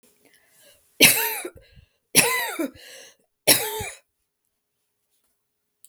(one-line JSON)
{"three_cough_length": "5.9 s", "three_cough_amplitude": 32768, "three_cough_signal_mean_std_ratio": 0.32, "survey_phase": "beta (2021-08-13 to 2022-03-07)", "age": "65+", "gender": "Female", "wearing_mask": "No", "symptom_none": true, "smoker_status": "Prefer not to say", "respiratory_condition_asthma": false, "respiratory_condition_other": false, "recruitment_source": "REACT", "submission_delay": "1 day", "covid_test_result": "Negative", "covid_test_method": "RT-qPCR"}